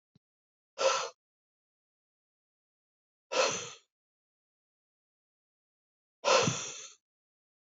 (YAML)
exhalation_length: 7.8 s
exhalation_amplitude: 7260
exhalation_signal_mean_std_ratio: 0.28
survey_phase: beta (2021-08-13 to 2022-03-07)
age: 18-44
gender: Male
wearing_mask: 'No'
symptom_cough_any: true
symptom_sore_throat: true
symptom_onset: 6 days
smoker_status: Never smoked
respiratory_condition_asthma: false
respiratory_condition_other: false
recruitment_source: REACT
submission_delay: 1 day
covid_test_result: Positive
covid_test_method: RT-qPCR
covid_ct_value: 21.8
covid_ct_gene: E gene
influenza_a_test_result: Negative
influenza_b_test_result: Negative